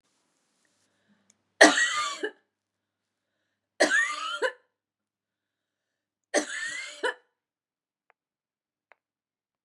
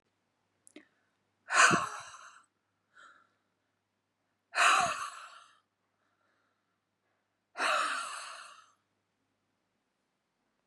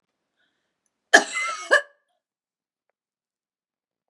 {
  "three_cough_length": "9.6 s",
  "three_cough_amplitude": 28431,
  "three_cough_signal_mean_std_ratio": 0.27,
  "exhalation_length": "10.7 s",
  "exhalation_amplitude": 10500,
  "exhalation_signal_mean_std_ratio": 0.29,
  "cough_length": "4.1 s",
  "cough_amplitude": 32768,
  "cough_signal_mean_std_ratio": 0.21,
  "survey_phase": "beta (2021-08-13 to 2022-03-07)",
  "age": "45-64",
  "gender": "Female",
  "wearing_mask": "No",
  "symptom_runny_or_blocked_nose": true,
  "symptom_onset": "12 days",
  "smoker_status": "Never smoked",
  "respiratory_condition_asthma": false,
  "respiratory_condition_other": false,
  "recruitment_source": "REACT",
  "submission_delay": "12 days",
  "covid_test_result": "Negative",
  "covid_test_method": "RT-qPCR",
  "influenza_a_test_result": "Unknown/Void",
  "influenza_b_test_result": "Unknown/Void"
}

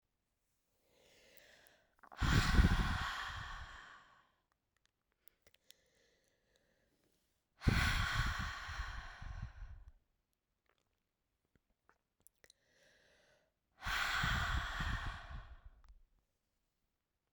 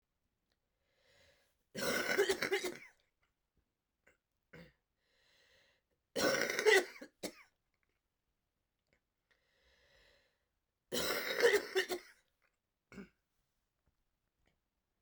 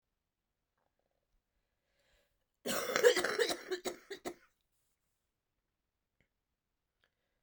{
  "exhalation_length": "17.3 s",
  "exhalation_amplitude": 4425,
  "exhalation_signal_mean_std_ratio": 0.38,
  "three_cough_length": "15.0 s",
  "three_cough_amplitude": 5330,
  "three_cough_signal_mean_std_ratio": 0.31,
  "cough_length": "7.4 s",
  "cough_amplitude": 7452,
  "cough_signal_mean_std_ratio": 0.26,
  "survey_phase": "beta (2021-08-13 to 2022-03-07)",
  "age": "18-44",
  "gender": "Female",
  "wearing_mask": "No",
  "symptom_cough_any": true,
  "symptom_runny_or_blocked_nose": true,
  "symptom_abdominal_pain": true,
  "symptom_fatigue": true,
  "symptom_fever_high_temperature": true,
  "symptom_headache": true,
  "symptom_change_to_sense_of_smell_or_taste": true,
  "symptom_loss_of_taste": true,
  "symptom_other": true,
  "symptom_onset": "4 days",
  "smoker_status": "Ex-smoker",
  "respiratory_condition_asthma": false,
  "respiratory_condition_other": false,
  "recruitment_source": "Test and Trace",
  "submission_delay": "2 days",
  "covid_test_result": "Positive",
  "covid_test_method": "RT-qPCR"
}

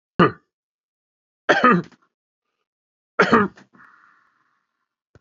{
  "three_cough_length": "5.2 s",
  "three_cough_amplitude": 30410,
  "three_cough_signal_mean_std_ratio": 0.28,
  "survey_phase": "beta (2021-08-13 to 2022-03-07)",
  "age": "65+",
  "gender": "Male",
  "wearing_mask": "No",
  "symptom_none": true,
  "smoker_status": "Never smoked",
  "respiratory_condition_asthma": false,
  "respiratory_condition_other": false,
  "recruitment_source": "REACT",
  "submission_delay": "7 days",
  "covid_test_result": "Negative",
  "covid_test_method": "RT-qPCR",
  "influenza_a_test_result": "Negative",
  "influenza_b_test_result": "Negative"
}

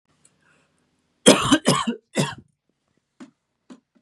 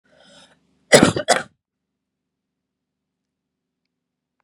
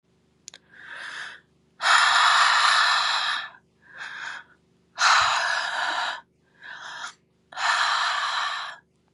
{
  "three_cough_length": "4.0 s",
  "three_cough_amplitude": 32767,
  "three_cough_signal_mean_std_ratio": 0.29,
  "cough_length": "4.4 s",
  "cough_amplitude": 32768,
  "cough_signal_mean_std_ratio": 0.2,
  "exhalation_length": "9.1 s",
  "exhalation_amplitude": 16856,
  "exhalation_signal_mean_std_ratio": 0.6,
  "survey_phase": "beta (2021-08-13 to 2022-03-07)",
  "age": "18-44",
  "gender": "Female",
  "wearing_mask": "No",
  "symptom_cough_any": true,
  "symptom_runny_or_blocked_nose": true,
  "symptom_shortness_of_breath": true,
  "symptom_sore_throat": true,
  "symptom_diarrhoea": true,
  "symptom_fatigue": true,
  "symptom_onset": "3 days",
  "smoker_status": "Current smoker (e-cigarettes or vapes only)",
  "respiratory_condition_asthma": false,
  "respiratory_condition_other": false,
  "recruitment_source": "Test and Trace",
  "submission_delay": "2 days",
  "covid_test_result": "Positive",
  "covid_test_method": "ePCR"
}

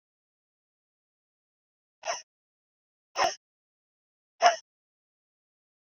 {
  "exhalation_length": "5.9 s",
  "exhalation_amplitude": 14796,
  "exhalation_signal_mean_std_ratio": 0.18,
  "survey_phase": "beta (2021-08-13 to 2022-03-07)",
  "age": "45-64",
  "gender": "Female",
  "wearing_mask": "No",
  "symptom_cough_any": true,
  "symptom_runny_or_blocked_nose": true,
  "symptom_sore_throat": true,
  "symptom_fatigue": true,
  "symptom_fever_high_temperature": true,
  "symptom_headache": true,
  "symptom_change_to_sense_of_smell_or_taste": true,
  "symptom_loss_of_taste": true,
  "symptom_onset": "4 days",
  "smoker_status": "Ex-smoker",
  "respiratory_condition_asthma": false,
  "respiratory_condition_other": false,
  "recruitment_source": "Test and Trace",
  "submission_delay": "2 days",
  "covid_test_result": "Positive",
  "covid_test_method": "RT-qPCR",
  "covid_ct_value": 20.7,
  "covid_ct_gene": "ORF1ab gene"
}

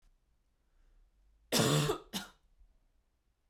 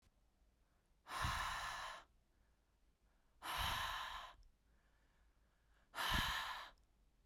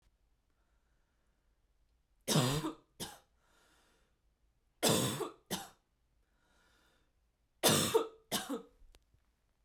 {
  "cough_length": "3.5 s",
  "cough_amplitude": 6400,
  "cough_signal_mean_std_ratio": 0.33,
  "exhalation_length": "7.3 s",
  "exhalation_amplitude": 1702,
  "exhalation_signal_mean_std_ratio": 0.51,
  "three_cough_length": "9.6 s",
  "three_cough_amplitude": 6081,
  "three_cough_signal_mean_std_ratio": 0.33,
  "survey_phase": "beta (2021-08-13 to 2022-03-07)",
  "age": "18-44",
  "gender": "Female",
  "wearing_mask": "No",
  "symptom_cough_any": true,
  "symptom_runny_or_blocked_nose": true,
  "symptom_sore_throat": true,
  "symptom_onset": "2 days",
  "smoker_status": "Never smoked",
  "respiratory_condition_asthma": false,
  "respiratory_condition_other": false,
  "recruitment_source": "Test and Trace",
  "submission_delay": "1 day",
  "covid_test_result": "Positive",
  "covid_test_method": "RT-qPCR",
  "covid_ct_value": 24.8,
  "covid_ct_gene": "N gene"
}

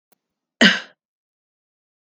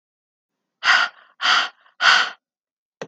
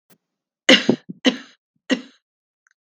{
  "cough_length": "2.1 s",
  "cough_amplitude": 32768,
  "cough_signal_mean_std_ratio": 0.21,
  "exhalation_length": "3.1 s",
  "exhalation_amplitude": 30796,
  "exhalation_signal_mean_std_ratio": 0.41,
  "three_cough_length": "2.8 s",
  "three_cough_amplitude": 32768,
  "three_cough_signal_mean_std_ratio": 0.26,
  "survey_phase": "beta (2021-08-13 to 2022-03-07)",
  "age": "45-64",
  "gender": "Female",
  "wearing_mask": "No",
  "symptom_none": true,
  "symptom_onset": "12 days",
  "smoker_status": "Never smoked",
  "respiratory_condition_asthma": false,
  "respiratory_condition_other": false,
  "recruitment_source": "REACT",
  "submission_delay": "0 days",
  "covid_test_result": "Negative",
  "covid_test_method": "RT-qPCR",
  "influenza_a_test_result": "Negative",
  "influenza_b_test_result": "Negative"
}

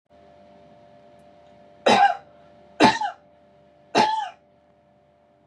{
  "three_cough_length": "5.5 s",
  "three_cough_amplitude": 27576,
  "three_cough_signal_mean_std_ratio": 0.33,
  "survey_phase": "beta (2021-08-13 to 2022-03-07)",
  "age": "45-64",
  "gender": "Female",
  "wearing_mask": "No",
  "symptom_none": true,
  "symptom_onset": "6 days",
  "smoker_status": "Ex-smoker",
  "respiratory_condition_asthma": false,
  "respiratory_condition_other": false,
  "recruitment_source": "REACT",
  "submission_delay": "4 days",
  "covid_test_result": "Negative",
  "covid_test_method": "RT-qPCR",
  "influenza_a_test_result": "Negative",
  "influenza_b_test_result": "Negative"
}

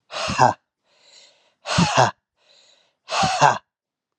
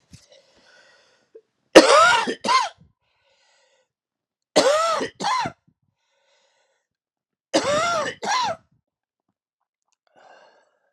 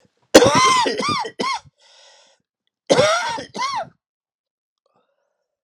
{
  "exhalation_length": "4.2 s",
  "exhalation_amplitude": 30389,
  "exhalation_signal_mean_std_ratio": 0.4,
  "three_cough_length": "10.9 s",
  "three_cough_amplitude": 32768,
  "three_cough_signal_mean_std_ratio": 0.34,
  "cough_length": "5.6 s",
  "cough_amplitude": 32768,
  "cough_signal_mean_std_ratio": 0.42,
  "survey_phase": "alpha (2021-03-01 to 2021-08-12)",
  "age": "45-64",
  "gender": "Male",
  "wearing_mask": "No",
  "symptom_cough_any": true,
  "symptom_new_continuous_cough": true,
  "symptom_shortness_of_breath": true,
  "symptom_diarrhoea": true,
  "symptom_fatigue": true,
  "symptom_fever_high_temperature": true,
  "symptom_headache": true,
  "symptom_onset": "3 days",
  "smoker_status": "Prefer not to say",
  "respiratory_condition_asthma": false,
  "respiratory_condition_other": false,
  "recruitment_source": "Test and Trace",
  "submission_delay": "1 day",
  "covid_test_result": "Positive",
  "covid_test_method": "RT-qPCR",
  "covid_ct_value": 12.8,
  "covid_ct_gene": "ORF1ab gene",
  "covid_ct_mean": 13.4,
  "covid_viral_load": "41000000 copies/ml",
  "covid_viral_load_category": "High viral load (>1M copies/ml)"
}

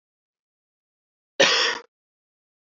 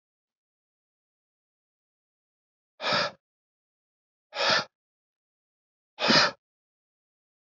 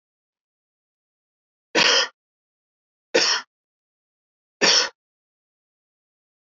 {
  "cough_length": "2.6 s",
  "cough_amplitude": 21607,
  "cough_signal_mean_std_ratio": 0.28,
  "exhalation_length": "7.4 s",
  "exhalation_amplitude": 14209,
  "exhalation_signal_mean_std_ratio": 0.26,
  "three_cough_length": "6.5 s",
  "three_cough_amplitude": 21687,
  "three_cough_signal_mean_std_ratio": 0.28,
  "survey_phase": "beta (2021-08-13 to 2022-03-07)",
  "age": "18-44",
  "gender": "Male",
  "wearing_mask": "No",
  "symptom_runny_or_blocked_nose": true,
  "symptom_sore_throat": true,
  "symptom_abdominal_pain": true,
  "symptom_fatigue": true,
  "symptom_headache": true,
  "smoker_status": "Never smoked",
  "respiratory_condition_asthma": false,
  "respiratory_condition_other": false,
  "recruitment_source": "Test and Trace",
  "submission_delay": "1 day",
  "covid_test_result": "Positive",
  "covid_test_method": "RT-qPCR",
  "covid_ct_value": 21.2,
  "covid_ct_gene": "ORF1ab gene"
}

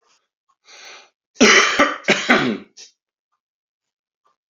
{
  "cough_length": "4.5 s",
  "cough_amplitude": 30920,
  "cough_signal_mean_std_ratio": 0.36,
  "survey_phase": "beta (2021-08-13 to 2022-03-07)",
  "age": "65+",
  "gender": "Male",
  "wearing_mask": "No",
  "symptom_cough_any": true,
  "symptom_runny_or_blocked_nose": true,
  "symptom_onset": "12 days",
  "smoker_status": "Ex-smoker",
  "respiratory_condition_asthma": false,
  "respiratory_condition_other": false,
  "recruitment_source": "REACT",
  "submission_delay": "1 day",
  "covid_test_result": "Negative",
  "covid_test_method": "RT-qPCR"
}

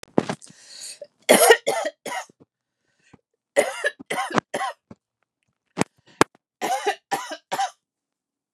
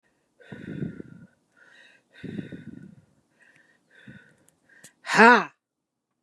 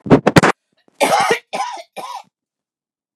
{
  "three_cough_length": "8.5 s",
  "three_cough_amplitude": 32768,
  "three_cough_signal_mean_std_ratio": 0.33,
  "exhalation_length": "6.2 s",
  "exhalation_amplitude": 31932,
  "exhalation_signal_mean_std_ratio": 0.21,
  "cough_length": "3.2 s",
  "cough_amplitude": 32768,
  "cough_signal_mean_std_ratio": 0.39,
  "survey_phase": "beta (2021-08-13 to 2022-03-07)",
  "age": "45-64",
  "gender": "Female",
  "wearing_mask": "No",
  "symptom_none": true,
  "smoker_status": "Current smoker (11 or more cigarettes per day)",
  "respiratory_condition_asthma": true,
  "respiratory_condition_other": false,
  "recruitment_source": "REACT",
  "submission_delay": "2 days",
  "covid_test_result": "Negative",
  "covid_test_method": "RT-qPCR",
  "influenza_a_test_result": "Negative",
  "influenza_b_test_result": "Negative"
}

